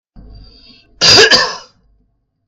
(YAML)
cough_length: 2.5 s
cough_amplitude: 32768
cough_signal_mean_std_ratio: 0.4
survey_phase: beta (2021-08-13 to 2022-03-07)
age: 45-64
gender: Male
wearing_mask: 'No'
symptom_none: true
smoker_status: Never smoked
respiratory_condition_asthma: false
respiratory_condition_other: false
recruitment_source: REACT
submission_delay: 2 days
covid_test_result: Negative
covid_test_method: RT-qPCR